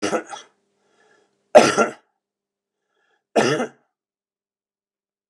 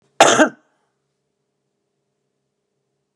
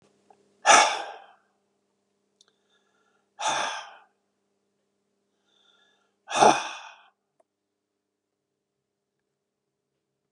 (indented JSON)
{
  "three_cough_length": "5.3 s",
  "three_cough_amplitude": 32768,
  "three_cough_signal_mean_std_ratio": 0.26,
  "cough_length": "3.2 s",
  "cough_amplitude": 32768,
  "cough_signal_mean_std_ratio": 0.22,
  "exhalation_length": "10.3 s",
  "exhalation_amplitude": 26843,
  "exhalation_signal_mean_std_ratio": 0.22,
  "survey_phase": "beta (2021-08-13 to 2022-03-07)",
  "age": "65+",
  "gender": "Male",
  "wearing_mask": "No",
  "symptom_runny_or_blocked_nose": true,
  "smoker_status": "Never smoked",
  "respiratory_condition_asthma": false,
  "respiratory_condition_other": true,
  "recruitment_source": "Test and Trace",
  "submission_delay": "2 days",
  "covid_test_result": "Positive",
  "covid_test_method": "RT-qPCR",
  "covid_ct_value": 22.3,
  "covid_ct_gene": "N gene"
}